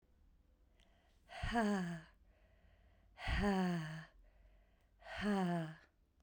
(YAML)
exhalation_length: 6.2 s
exhalation_amplitude: 2261
exhalation_signal_mean_std_ratio: 0.53
survey_phase: beta (2021-08-13 to 2022-03-07)
age: 45-64
gender: Female
wearing_mask: 'No'
symptom_cough_any: true
symptom_runny_or_blocked_nose: true
symptom_sore_throat: true
symptom_fatigue: true
symptom_headache: true
symptom_onset: 2 days
smoker_status: Never smoked
respiratory_condition_asthma: false
respiratory_condition_other: false
recruitment_source: Test and Trace
submission_delay: 1 day
covid_test_result: Positive
covid_test_method: RT-qPCR
covid_ct_value: 19.3
covid_ct_gene: ORF1ab gene
covid_ct_mean: 19.5
covid_viral_load: 390000 copies/ml
covid_viral_load_category: Low viral load (10K-1M copies/ml)